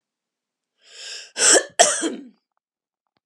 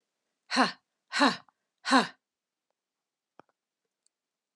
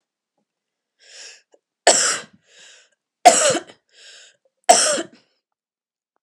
{
  "cough_length": "3.3 s",
  "cough_amplitude": 32594,
  "cough_signal_mean_std_ratio": 0.33,
  "exhalation_length": "4.6 s",
  "exhalation_amplitude": 11959,
  "exhalation_signal_mean_std_ratio": 0.26,
  "three_cough_length": "6.2 s",
  "three_cough_amplitude": 32768,
  "three_cough_signal_mean_std_ratio": 0.29,
  "survey_phase": "beta (2021-08-13 to 2022-03-07)",
  "age": "45-64",
  "gender": "Female",
  "wearing_mask": "No",
  "symptom_none": true,
  "smoker_status": "Ex-smoker",
  "respiratory_condition_asthma": false,
  "respiratory_condition_other": false,
  "recruitment_source": "REACT",
  "submission_delay": "2 days",
  "covid_test_result": "Negative",
  "covid_test_method": "RT-qPCR"
}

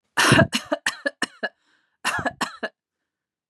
{
  "cough_length": "3.5 s",
  "cough_amplitude": 25458,
  "cough_signal_mean_std_ratio": 0.38,
  "survey_phase": "beta (2021-08-13 to 2022-03-07)",
  "age": "45-64",
  "gender": "Female",
  "wearing_mask": "No",
  "symptom_none": true,
  "smoker_status": "Never smoked",
  "respiratory_condition_asthma": false,
  "respiratory_condition_other": false,
  "recruitment_source": "REACT",
  "submission_delay": "2 days",
  "covid_test_result": "Negative",
  "covid_test_method": "RT-qPCR",
  "influenza_a_test_result": "Unknown/Void",
  "influenza_b_test_result": "Unknown/Void"
}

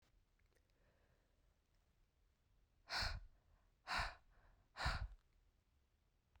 {
  "exhalation_length": "6.4 s",
  "exhalation_amplitude": 1406,
  "exhalation_signal_mean_std_ratio": 0.34,
  "survey_phase": "beta (2021-08-13 to 2022-03-07)",
  "age": "18-44",
  "gender": "Female",
  "wearing_mask": "No",
  "symptom_cough_any": true,
  "symptom_runny_or_blocked_nose": true,
  "symptom_shortness_of_breath": true,
  "symptom_diarrhoea": true,
  "symptom_fatigue": true,
  "symptom_fever_high_temperature": true,
  "symptom_headache": true,
  "symptom_change_to_sense_of_smell_or_taste": true,
  "symptom_loss_of_taste": true,
  "symptom_onset": "5 days",
  "smoker_status": "Never smoked",
  "respiratory_condition_asthma": false,
  "respiratory_condition_other": false,
  "recruitment_source": "Test and Trace",
  "submission_delay": "2 days",
  "covid_test_result": "Positive",
  "covid_test_method": "RT-qPCR",
  "covid_ct_value": 14.7,
  "covid_ct_gene": "ORF1ab gene",
  "covid_ct_mean": 15.0,
  "covid_viral_load": "12000000 copies/ml",
  "covid_viral_load_category": "High viral load (>1M copies/ml)"
}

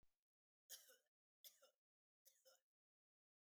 {
  "three_cough_length": "3.6 s",
  "three_cough_amplitude": 202,
  "three_cough_signal_mean_std_ratio": 0.28,
  "survey_phase": "beta (2021-08-13 to 2022-03-07)",
  "age": "45-64",
  "gender": "Female",
  "wearing_mask": "No",
  "symptom_none": true,
  "smoker_status": "Never smoked",
  "respiratory_condition_asthma": false,
  "respiratory_condition_other": false,
  "recruitment_source": "REACT",
  "submission_delay": "1 day",
  "covid_test_result": "Negative",
  "covid_test_method": "RT-qPCR",
  "influenza_a_test_result": "Negative",
  "influenza_b_test_result": "Negative"
}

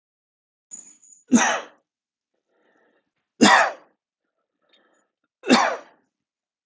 {
  "three_cough_length": "6.7 s",
  "three_cough_amplitude": 29525,
  "three_cough_signal_mean_std_ratio": 0.28,
  "survey_phase": "beta (2021-08-13 to 2022-03-07)",
  "age": "45-64",
  "gender": "Male",
  "wearing_mask": "No",
  "symptom_none": true,
  "smoker_status": "Never smoked",
  "respiratory_condition_asthma": false,
  "respiratory_condition_other": false,
  "recruitment_source": "REACT",
  "submission_delay": "1 day",
  "covid_test_result": "Negative",
  "covid_test_method": "RT-qPCR"
}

